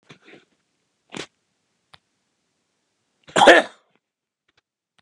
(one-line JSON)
{"cough_length": "5.0 s", "cough_amplitude": 32768, "cough_signal_mean_std_ratio": 0.18, "survey_phase": "beta (2021-08-13 to 2022-03-07)", "age": "65+", "gender": "Male", "wearing_mask": "No", "symptom_shortness_of_breath": true, "smoker_status": "Ex-smoker", "respiratory_condition_asthma": false, "respiratory_condition_other": true, "recruitment_source": "REACT", "submission_delay": "1 day", "covid_test_result": "Negative", "covid_test_method": "RT-qPCR", "influenza_a_test_result": "Negative", "influenza_b_test_result": "Negative"}